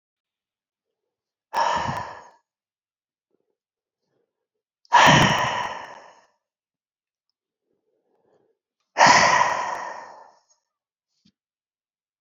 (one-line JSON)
{"exhalation_length": "12.2 s", "exhalation_amplitude": 26898, "exhalation_signal_mean_std_ratio": 0.31, "survey_phase": "beta (2021-08-13 to 2022-03-07)", "age": "65+", "gender": "Male", "wearing_mask": "No", "symptom_none": true, "symptom_onset": "10 days", "smoker_status": "Ex-smoker", "respiratory_condition_asthma": false, "respiratory_condition_other": true, "recruitment_source": "REACT", "submission_delay": "1 day", "covid_test_result": "Negative", "covid_test_method": "RT-qPCR", "influenza_a_test_result": "Negative", "influenza_b_test_result": "Negative"}